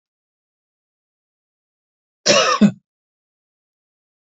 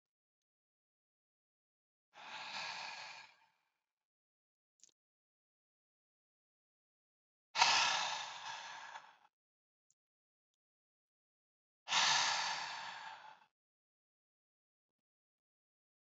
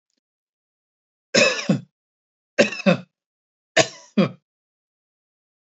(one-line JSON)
{"cough_length": "4.3 s", "cough_amplitude": 31540, "cough_signal_mean_std_ratio": 0.24, "exhalation_length": "16.0 s", "exhalation_amplitude": 6522, "exhalation_signal_mean_std_ratio": 0.29, "three_cough_length": "5.7 s", "three_cough_amplitude": 27733, "three_cough_signal_mean_std_ratio": 0.28, "survey_phase": "beta (2021-08-13 to 2022-03-07)", "age": "45-64", "gender": "Male", "wearing_mask": "No", "symptom_cough_any": true, "smoker_status": "Never smoked", "respiratory_condition_asthma": true, "respiratory_condition_other": false, "recruitment_source": "REACT", "submission_delay": "1 day", "covid_test_result": "Negative", "covid_test_method": "RT-qPCR", "influenza_a_test_result": "Negative", "influenza_b_test_result": "Negative"}